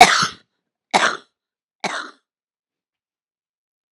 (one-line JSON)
{"three_cough_length": "3.9 s", "three_cough_amplitude": 32768, "three_cough_signal_mean_std_ratio": 0.26, "survey_phase": "alpha (2021-03-01 to 2021-08-12)", "age": "45-64", "gender": "Female", "wearing_mask": "No", "symptom_cough_any": true, "symptom_shortness_of_breath": true, "symptom_fatigue": true, "symptom_headache": true, "symptom_change_to_sense_of_smell_or_taste": true, "symptom_loss_of_taste": true, "smoker_status": "Current smoker (1 to 10 cigarettes per day)", "respiratory_condition_asthma": false, "respiratory_condition_other": false, "recruitment_source": "Test and Trace", "submission_delay": "2 days", "covid_test_result": "Positive", "covid_test_method": "RT-qPCR"}